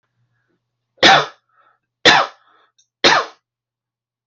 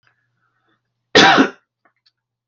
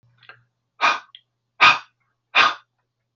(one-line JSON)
{"three_cough_length": "4.3 s", "three_cough_amplitude": 31080, "three_cough_signal_mean_std_ratio": 0.31, "cough_length": "2.5 s", "cough_amplitude": 29563, "cough_signal_mean_std_ratio": 0.3, "exhalation_length": "3.2 s", "exhalation_amplitude": 29239, "exhalation_signal_mean_std_ratio": 0.3, "survey_phase": "beta (2021-08-13 to 2022-03-07)", "age": "45-64", "gender": "Male", "wearing_mask": "No", "symptom_none": true, "smoker_status": "Never smoked", "respiratory_condition_asthma": false, "respiratory_condition_other": false, "recruitment_source": "Test and Trace", "submission_delay": "0 days", "covid_test_result": "Negative", "covid_test_method": "LFT"}